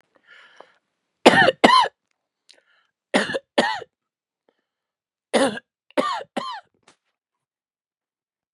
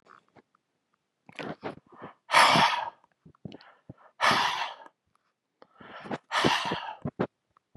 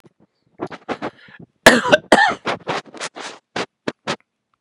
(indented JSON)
{
  "three_cough_length": "8.5 s",
  "three_cough_amplitude": 32768,
  "three_cough_signal_mean_std_ratio": 0.29,
  "exhalation_length": "7.8 s",
  "exhalation_amplitude": 16376,
  "exhalation_signal_mean_std_ratio": 0.38,
  "cough_length": "4.6 s",
  "cough_amplitude": 32768,
  "cough_signal_mean_std_ratio": 0.34,
  "survey_phase": "beta (2021-08-13 to 2022-03-07)",
  "age": "45-64",
  "gender": "Male",
  "wearing_mask": "No",
  "symptom_none": true,
  "symptom_onset": "5 days",
  "smoker_status": "Ex-smoker",
  "respiratory_condition_asthma": false,
  "respiratory_condition_other": false,
  "recruitment_source": "REACT",
  "submission_delay": "3 days",
  "covid_test_result": "Negative",
  "covid_test_method": "RT-qPCR",
  "influenza_a_test_result": "Negative",
  "influenza_b_test_result": "Negative"
}